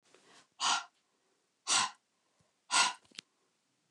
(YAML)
exhalation_length: 3.9 s
exhalation_amplitude: 7115
exhalation_signal_mean_std_ratio: 0.33
survey_phase: beta (2021-08-13 to 2022-03-07)
age: 65+
gender: Female
wearing_mask: 'No'
symptom_none: true
smoker_status: Never smoked
respiratory_condition_asthma: false
respiratory_condition_other: false
recruitment_source: REACT
submission_delay: 1 day
covid_test_result: Negative
covid_test_method: RT-qPCR